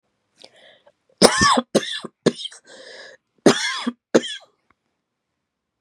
cough_length: 5.8 s
cough_amplitude: 32768
cough_signal_mean_std_ratio: 0.32
survey_phase: beta (2021-08-13 to 2022-03-07)
age: 18-44
gender: Female
wearing_mask: 'No'
symptom_cough_any: true
symptom_sore_throat: true
symptom_fatigue: true
symptom_headache: true
symptom_change_to_sense_of_smell_or_taste: true
symptom_loss_of_taste: true
symptom_onset: 5 days
smoker_status: Never smoked
respiratory_condition_asthma: false
respiratory_condition_other: false
recruitment_source: Test and Trace
submission_delay: 3 days
covid_test_result: Positive
covid_test_method: ePCR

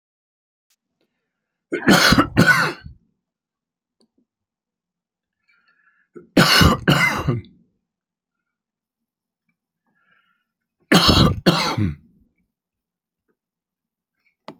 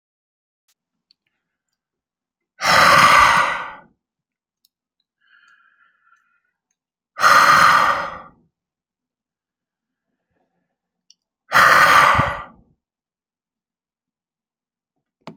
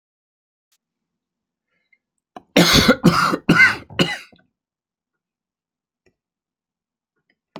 three_cough_length: 14.6 s
three_cough_amplitude: 32768
three_cough_signal_mean_std_ratio: 0.33
exhalation_length: 15.4 s
exhalation_amplitude: 32672
exhalation_signal_mean_std_ratio: 0.34
cough_length: 7.6 s
cough_amplitude: 29846
cough_signal_mean_std_ratio: 0.29
survey_phase: alpha (2021-03-01 to 2021-08-12)
age: 65+
gender: Male
wearing_mask: 'No'
symptom_none: true
smoker_status: Never smoked
respiratory_condition_asthma: false
respiratory_condition_other: false
recruitment_source: REACT
submission_delay: 1 day
covid_test_result: Negative
covid_test_method: RT-qPCR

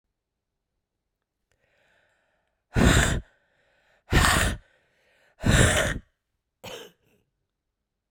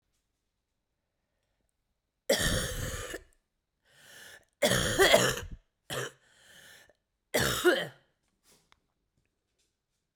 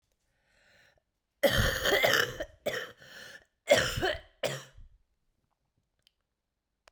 exhalation_length: 8.1 s
exhalation_amplitude: 24793
exhalation_signal_mean_std_ratio: 0.34
three_cough_length: 10.2 s
three_cough_amplitude: 13644
three_cough_signal_mean_std_ratio: 0.35
cough_length: 6.9 s
cough_amplitude: 11509
cough_signal_mean_std_ratio: 0.38
survey_phase: beta (2021-08-13 to 2022-03-07)
age: 18-44
gender: Female
wearing_mask: 'No'
symptom_cough_any: true
symptom_runny_or_blocked_nose: true
symptom_shortness_of_breath: true
symptom_headache: true
symptom_change_to_sense_of_smell_or_taste: true
smoker_status: Ex-smoker
respiratory_condition_asthma: true
respiratory_condition_other: false
recruitment_source: Test and Trace
submission_delay: 1 day
covid_test_result: Positive
covid_test_method: RT-qPCR
covid_ct_value: 16.4
covid_ct_gene: ORF1ab gene
covid_ct_mean: 16.8
covid_viral_load: 3200000 copies/ml
covid_viral_load_category: High viral load (>1M copies/ml)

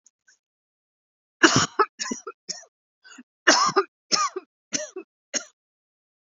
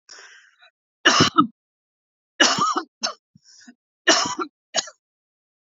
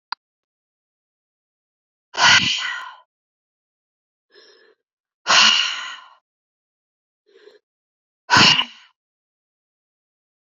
cough_length: 6.2 s
cough_amplitude: 29411
cough_signal_mean_std_ratio: 0.31
three_cough_length: 5.7 s
three_cough_amplitude: 32767
three_cough_signal_mean_std_ratio: 0.35
exhalation_length: 10.4 s
exhalation_amplitude: 31984
exhalation_signal_mean_std_ratio: 0.28
survey_phase: alpha (2021-03-01 to 2021-08-12)
age: 45-64
gender: Female
wearing_mask: 'No'
symptom_none: true
symptom_onset: 12 days
smoker_status: Never smoked
respiratory_condition_asthma: true
respiratory_condition_other: false
recruitment_source: REACT
submission_delay: 3 days
covid_test_result: Negative
covid_test_method: RT-qPCR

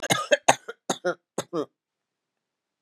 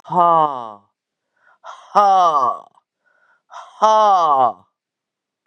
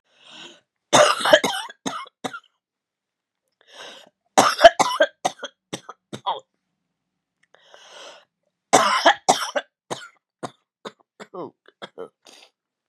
cough_length: 2.8 s
cough_amplitude: 30437
cough_signal_mean_std_ratio: 0.3
exhalation_length: 5.5 s
exhalation_amplitude: 32595
exhalation_signal_mean_std_ratio: 0.49
three_cough_length: 12.9 s
three_cough_amplitude: 32768
three_cough_signal_mean_std_ratio: 0.29
survey_phase: beta (2021-08-13 to 2022-03-07)
age: 45-64
gender: Female
wearing_mask: 'No'
symptom_cough_any: true
symptom_runny_or_blocked_nose: true
symptom_sore_throat: true
symptom_fatigue: true
symptom_onset: 8 days
smoker_status: Never smoked
respiratory_condition_asthma: false
respiratory_condition_other: false
recruitment_source: Test and Trace
submission_delay: 1 day
covid_test_result: Positive
covid_test_method: ePCR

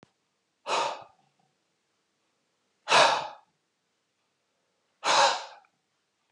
exhalation_length: 6.3 s
exhalation_amplitude: 14721
exhalation_signal_mean_std_ratio: 0.3
survey_phase: alpha (2021-03-01 to 2021-08-12)
age: 45-64
gender: Male
wearing_mask: 'No'
symptom_none: true
smoker_status: Ex-smoker
respiratory_condition_asthma: false
respiratory_condition_other: false
recruitment_source: REACT
submission_delay: 32 days
covid_test_result: Negative
covid_test_method: RT-qPCR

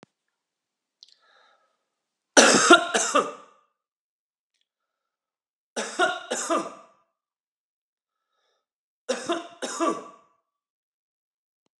three_cough_length: 11.8 s
three_cough_amplitude: 28704
three_cough_signal_mean_std_ratio: 0.27
survey_phase: beta (2021-08-13 to 2022-03-07)
age: 45-64
gender: Male
wearing_mask: 'No'
symptom_cough_any: true
symptom_runny_or_blocked_nose: true
symptom_onset: 6 days
smoker_status: Ex-smoker
respiratory_condition_asthma: false
respiratory_condition_other: false
recruitment_source: REACT
submission_delay: 2 days
covid_test_result: Negative
covid_test_method: RT-qPCR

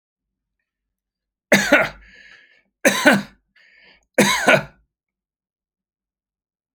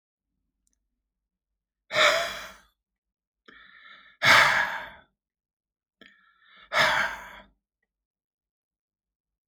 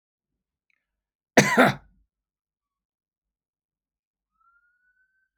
three_cough_length: 6.7 s
three_cough_amplitude: 31977
three_cough_signal_mean_std_ratio: 0.31
exhalation_length: 9.5 s
exhalation_amplitude: 20063
exhalation_signal_mean_std_ratio: 0.3
cough_length: 5.4 s
cough_amplitude: 27797
cough_signal_mean_std_ratio: 0.18
survey_phase: alpha (2021-03-01 to 2021-08-12)
age: 65+
gender: Male
wearing_mask: 'No'
symptom_none: true
smoker_status: Ex-smoker
respiratory_condition_asthma: false
respiratory_condition_other: false
recruitment_source: REACT
submission_delay: 1 day
covid_test_result: Negative
covid_test_method: RT-qPCR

